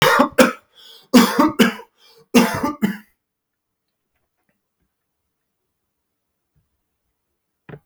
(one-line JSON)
{"three_cough_length": "7.9 s", "three_cough_amplitude": 32768, "three_cough_signal_mean_std_ratio": 0.31, "survey_phase": "beta (2021-08-13 to 2022-03-07)", "age": "65+", "gender": "Male", "wearing_mask": "No", "symptom_sore_throat": true, "smoker_status": "Never smoked", "respiratory_condition_asthma": false, "respiratory_condition_other": false, "recruitment_source": "REACT", "submission_delay": "2 days", "covid_test_result": "Negative", "covid_test_method": "RT-qPCR", "influenza_a_test_result": "Unknown/Void", "influenza_b_test_result": "Unknown/Void"}